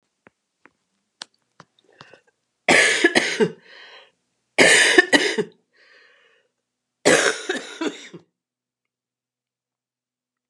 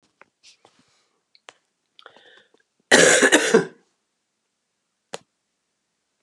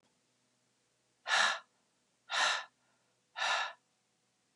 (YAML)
three_cough_length: 10.5 s
three_cough_amplitude: 32767
three_cough_signal_mean_std_ratio: 0.33
cough_length: 6.2 s
cough_amplitude: 32648
cough_signal_mean_std_ratio: 0.26
exhalation_length: 4.6 s
exhalation_amplitude: 5157
exhalation_signal_mean_std_ratio: 0.37
survey_phase: beta (2021-08-13 to 2022-03-07)
age: 65+
gender: Female
wearing_mask: 'No'
symptom_cough_any: true
symptom_runny_or_blocked_nose: true
symptom_headache: true
symptom_onset: 5 days
smoker_status: Never smoked
respiratory_condition_asthma: false
respiratory_condition_other: false
recruitment_source: Test and Trace
submission_delay: 1 day
covid_test_result: Positive
covid_test_method: RT-qPCR
covid_ct_value: 17.6
covid_ct_gene: N gene
covid_ct_mean: 17.8
covid_viral_load: 1500000 copies/ml
covid_viral_load_category: High viral load (>1M copies/ml)